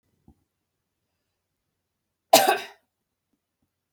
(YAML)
cough_length: 3.9 s
cough_amplitude: 28605
cough_signal_mean_std_ratio: 0.18
survey_phase: beta (2021-08-13 to 2022-03-07)
age: 45-64
gender: Female
wearing_mask: 'No'
symptom_none: true
smoker_status: Never smoked
respiratory_condition_asthma: false
respiratory_condition_other: false
recruitment_source: REACT
submission_delay: 2 days
covid_test_result: Negative
covid_test_method: RT-qPCR